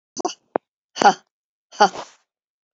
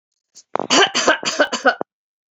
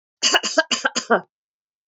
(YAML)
exhalation_length: 2.7 s
exhalation_amplitude: 30706
exhalation_signal_mean_std_ratio: 0.24
three_cough_length: 2.3 s
three_cough_amplitude: 28280
three_cough_signal_mean_std_ratio: 0.45
cough_length: 1.9 s
cough_amplitude: 25726
cough_signal_mean_std_ratio: 0.43
survey_phase: beta (2021-08-13 to 2022-03-07)
age: 45-64
gender: Female
wearing_mask: 'No'
symptom_none: true
smoker_status: Never smoked
respiratory_condition_asthma: false
respiratory_condition_other: false
recruitment_source: REACT
submission_delay: 2 days
covid_test_result: Negative
covid_test_method: RT-qPCR